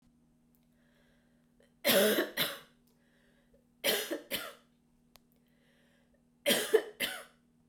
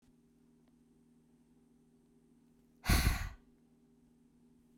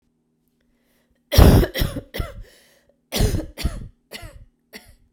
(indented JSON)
{
  "three_cough_length": "7.7 s",
  "three_cough_amplitude": 7613,
  "three_cough_signal_mean_std_ratio": 0.35,
  "exhalation_length": "4.8 s",
  "exhalation_amplitude": 4552,
  "exhalation_signal_mean_std_ratio": 0.26,
  "cough_length": "5.1 s",
  "cough_amplitude": 32767,
  "cough_signal_mean_std_ratio": 0.33,
  "survey_phase": "beta (2021-08-13 to 2022-03-07)",
  "age": "18-44",
  "gender": "Female",
  "wearing_mask": "No",
  "symptom_cough_any": true,
  "symptom_runny_or_blocked_nose": true,
  "symptom_shortness_of_breath": true,
  "symptom_fatigue": true,
  "symptom_headache": true,
  "smoker_status": "Never smoked",
  "respiratory_condition_asthma": true,
  "respiratory_condition_other": false,
  "recruitment_source": "Test and Trace",
  "submission_delay": "2 days",
  "covid_test_result": "Positive",
  "covid_test_method": "RT-qPCR",
  "covid_ct_value": 25.6,
  "covid_ct_gene": "ORF1ab gene",
  "covid_ct_mean": 26.1,
  "covid_viral_load": "2600 copies/ml",
  "covid_viral_load_category": "Minimal viral load (< 10K copies/ml)"
}